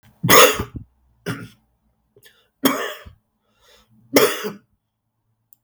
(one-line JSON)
{"three_cough_length": "5.6 s", "three_cough_amplitude": 32768, "three_cough_signal_mean_std_ratio": 0.3, "survey_phase": "beta (2021-08-13 to 2022-03-07)", "age": "65+", "gender": "Male", "wearing_mask": "No", "symptom_cough_any": true, "symptom_runny_or_blocked_nose": true, "symptom_sore_throat": true, "symptom_fever_high_temperature": true, "smoker_status": "Never smoked", "respiratory_condition_asthma": false, "respiratory_condition_other": false, "recruitment_source": "Test and Trace", "submission_delay": "2 days", "covid_test_result": "Positive", "covid_test_method": "LFT"}